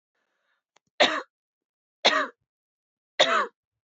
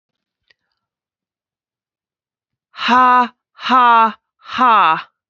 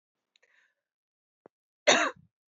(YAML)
three_cough_length: 3.9 s
three_cough_amplitude: 20783
three_cough_signal_mean_std_ratio: 0.31
exhalation_length: 5.3 s
exhalation_amplitude: 29311
exhalation_signal_mean_std_ratio: 0.4
cough_length: 2.5 s
cough_amplitude: 15475
cough_signal_mean_std_ratio: 0.23
survey_phase: beta (2021-08-13 to 2022-03-07)
age: 18-44
gender: Female
wearing_mask: 'No'
symptom_none: true
smoker_status: Current smoker (11 or more cigarettes per day)
respiratory_condition_asthma: false
respiratory_condition_other: false
recruitment_source: REACT
submission_delay: 1 day
covid_test_result: Negative
covid_test_method: RT-qPCR